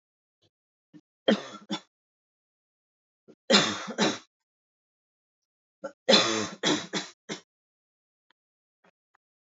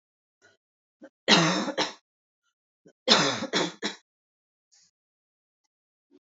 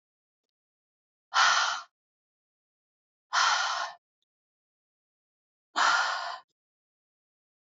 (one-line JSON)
{"three_cough_length": "9.6 s", "three_cough_amplitude": 20168, "three_cough_signal_mean_std_ratio": 0.29, "cough_length": "6.2 s", "cough_amplitude": 22536, "cough_signal_mean_std_ratio": 0.32, "exhalation_length": "7.7 s", "exhalation_amplitude": 11495, "exhalation_signal_mean_std_ratio": 0.35, "survey_phase": "beta (2021-08-13 to 2022-03-07)", "age": "18-44", "gender": "Female", "wearing_mask": "No", "symptom_cough_any": true, "symptom_runny_or_blocked_nose": true, "symptom_fatigue": true, "symptom_fever_high_temperature": true, "symptom_headache": true, "symptom_change_to_sense_of_smell_or_taste": true, "symptom_other": true, "smoker_status": "Current smoker (1 to 10 cigarettes per day)", "respiratory_condition_asthma": false, "respiratory_condition_other": false, "recruitment_source": "Test and Trace", "submission_delay": "1 day", "covid_test_result": "Positive", "covid_test_method": "RT-qPCR"}